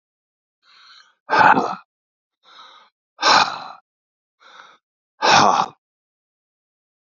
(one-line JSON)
{"exhalation_length": "7.2 s", "exhalation_amplitude": 30739, "exhalation_signal_mean_std_ratio": 0.32, "survey_phase": "beta (2021-08-13 to 2022-03-07)", "age": "45-64", "gender": "Male", "wearing_mask": "No", "symptom_cough_any": true, "symptom_runny_or_blocked_nose": true, "symptom_sore_throat": true, "symptom_abdominal_pain": true, "symptom_headache": true, "smoker_status": "Never smoked", "respiratory_condition_asthma": false, "respiratory_condition_other": false, "recruitment_source": "Test and Trace", "submission_delay": "1 day", "covid_test_result": "Positive", "covid_test_method": "LFT"}